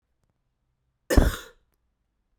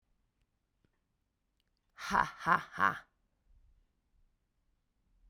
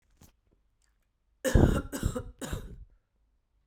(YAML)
cough_length: 2.4 s
cough_amplitude: 23394
cough_signal_mean_std_ratio: 0.23
exhalation_length: 5.3 s
exhalation_amplitude: 7951
exhalation_signal_mean_std_ratio: 0.23
three_cough_length: 3.7 s
three_cough_amplitude: 15667
three_cough_signal_mean_std_ratio: 0.33
survey_phase: beta (2021-08-13 to 2022-03-07)
age: 18-44
gender: Female
wearing_mask: 'No'
symptom_cough_any: true
symptom_sore_throat: true
symptom_fatigue: true
symptom_headache: true
symptom_onset: 2 days
smoker_status: Ex-smoker
respiratory_condition_asthma: false
respiratory_condition_other: false
recruitment_source: Test and Trace
submission_delay: 2 days
covid_test_result: Positive
covid_test_method: RT-qPCR
covid_ct_value: 24.3
covid_ct_gene: N gene